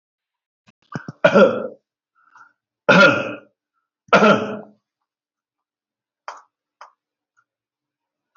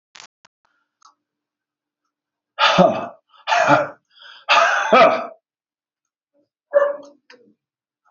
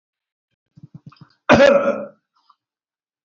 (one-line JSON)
{"three_cough_length": "8.4 s", "three_cough_amplitude": 32501, "three_cough_signal_mean_std_ratio": 0.29, "exhalation_length": "8.1 s", "exhalation_amplitude": 27765, "exhalation_signal_mean_std_ratio": 0.37, "cough_length": "3.2 s", "cough_amplitude": 28790, "cough_signal_mean_std_ratio": 0.3, "survey_phase": "beta (2021-08-13 to 2022-03-07)", "age": "65+", "gender": "Male", "wearing_mask": "No", "symptom_none": true, "smoker_status": "Never smoked", "respiratory_condition_asthma": false, "respiratory_condition_other": false, "recruitment_source": "REACT", "submission_delay": "2 days", "covid_test_result": "Negative", "covid_test_method": "RT-qPCR", "influenza_a_test_result": "Negative", "influenza_b_test_result": "Negative"}